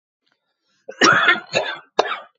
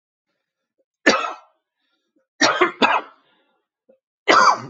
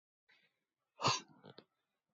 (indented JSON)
{
  "cough_length": "2.4 s",
  "cough_amplitude": 28004,
  "cough_signal_mean_std_ratio": 0.43,
  "three_cough_length": "4.7 s",
  "three_cough_amplitude": 29746,
  "three_cough_signal_mean_std_ratio": 0.36,
  "exhalation_length": "2.1 s",
  "exhalation_amplitude": 3240,
  "exhalation_signal_mean_std_ratio": 0.24,
  "survey_phase": "beta (2021-08-13 to 2022-03-07)",
  "age": "45-64",
  "gender": "Male",
  "wearing_mask": "No",
  "symptom_runny_or_blocked_nose": true,
  "symptom_sore_throat": true,
  "symptom_abdominal_pain": true,
  "symptom_fatigue": true,
  "symptom_headache": true,
  "symptom_onset": "12 days",
  "smoker_status": "Current smoker (11 or more cigarettes per day)",
  "respiratory_condition_asthma": false,
  "respiratory_condition_other": false,
  "recruitment_source": "REACT",
  "submission_delay": "2 days",
  "covid_test_result": "Negative",
  "covid_test_method": "RT-qPCR",
  "influenza_a_test_result": "Negative",
  "influenza_b_test_result": "Negative"
}